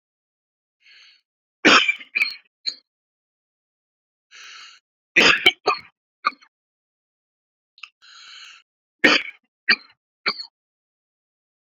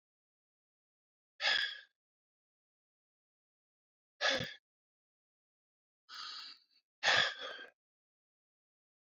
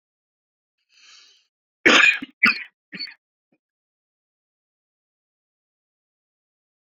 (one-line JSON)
{"three_cough_length": "11.7 s", "three_cough_amplitude": 31856, "three_cough_signal_mean_std_ratio": 0.25, "exhalation_length": "9.0 s", "exhalation_amplitude": 5068, "exhalation_signal_mean_std_ratio": 0.27, "cough_length": "6.8 s", "cough_amplitude": 29210, "cough_signal_mean_std_ratio": 0.21, "survey_phase": "beta (2021-08-13 to 2022-03-07)", "age": "45-64", "gender": "Male", "wearing_mask": "No", "symptom_none": true, "symptom_onset": "12 days", "smoker_status": "Ex-smoker", "respiratory_condition_asthma": false, "respiratory_condition_other": false, "recruitment_source": "REACT", "submission_delay": "2 days", "covid_test_result": "Negative", "covid_test_method": "RT-qPCR"}